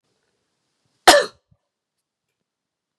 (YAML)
cough_length: 3.0 s
cough_amplitude: 32768
cough_signal_mean_std_ratio: 0.18
survey_phase: beta (2021-08-13 to 2022-03-07)
age: 45-64
gender: Female
wearing_mask: 'No'
symptom_none: true
smoker_status: Never smoked
respiratory_condition_asthma: false
respiratory_condition_other: false
recruitment_source: REACT
submission_delay: 1 day
covid_test_result: Negative
covid_test_method: RT-qPCR